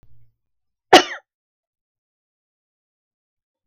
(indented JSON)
{
  "cough_length": "3.7 s",
  "cough_amplitude": 32768,
  "cough_signal_mean_std_ratio": 0.14,
  "survey_phase": "beta (2021-08-13 to 2022-03-07)",
  "age": "45-64",
  "gender": "Female",
  "wearing_mask": "No",
  "symptom_none": true,
  "smoker_status": "Never smoked",
  "respiratory_condition_asthma": false,
  "respiratory_condition_other": false,
  "recruitment_source": "REACT",
  "submission_delay": "2 days",
  "covid_test_result": "Negative",
  "covid_test_method": "RT-qPCR"
}